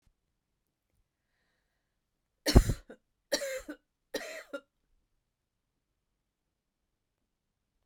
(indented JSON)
{
  "three_cough_length": "7.9 s",
  "three_cough_amplitude": 22597,
  "three_cough_signal_mean_std_ratio": 0.17,
  "survey_phase": "beta (2021-08-13 to 2022-03-07)",
  "age": "45-64",
  "gender": "Female",
  "wearing_mask": "No",
  "symptom_none": true,
  "smoker_status": "Never smoked",
  "respiratory_condition_asthma": false,
  "respiratory_condition_other": false,
  "recruitment_source": "REACT",
  "submission_delay": "2 days",
  "covid_test_result": "Negative",
  "covid_test_method": "RT-qPCR",
  "influenza_a_test_result": "Unknown/Void",
  "influenza_b_test_result": "Unknown/Void"
}